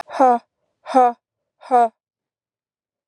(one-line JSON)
{"exhalation_length": "3.1 s", "exhalation_amplitude": 26605, "exhalation_signal_mean_std_ratio": 0.36, "survey_phase": "alpha (2021-03-01 to 2021-08-12)", "age": "18-44", "gender": "Female", "wearing_mask": "No", "symptom_cough_any": true, "symptom_shortness_of_breath": true, "symptom_headache": true, "smoker_status": "Never smoked", "respiratory_condition_asthma": false, "respiratory_condition_other": false, "recruitment_source": "Test and Trace", "submission_delay": "1 day", "covid_test_result": "Positive", "covid_test_method": "LFT"}